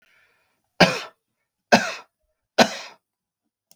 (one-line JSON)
{"three_cough_length": "3.8 s", "three_cough_amplitude": 32768, "three_cough_signal_mean_std_ratio": 0.25, "survey_phase": "beta (2021-08-13 to 2022-03-07)", "age": "65+", "gender": "Male", "wearing_mask": "No", "symptom_none": true, "smoker_status": "Never smoked", "respiratory_condition_asthma": false, "respiratory_condition_other": false, "recruitment_source": "REACT", "submission_delay": "1 day", "covid_test_result": "Negative", "covid_test_method": "RT-qPCR"}